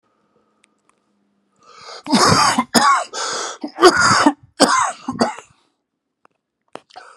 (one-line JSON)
{"cough_length": "7.2 s", "cough_amplitude": 32768, "cough_signal_mean_std_ratio": 0.44, "survey_phase": "beta (2021-08-13 to 2022-03-07)", "age": "45-64", "gender": "Male", "wearing_mask": "No", "symptom_cough_any": true, "symptom_runny_or_blocked_nose": true, "symptom_shortness_of_breath": true, "symptom_fatigue": true, "symptom_headache": true, "symptom_loss_of_taste": true, "symptom_onset": "2 days", "smoker_status": "Never smoked", "respiratory_condition_asthma": false, "respiratory_condition_other": false, "recruitment_source": "Test and Trace", "submission_delay": "2 days", "covid_test_result": "Positive", "covid_test_method": "RT-qPCR", "covid_ct_value": 14.6, "covid_ct_gene": "ORF1ab gene", "covid_ct_mean": 15.0, "covid_viral_load": "12000000 copies/ml", "covid_viral_load_category": "High viral load (>1M copies/ml)"}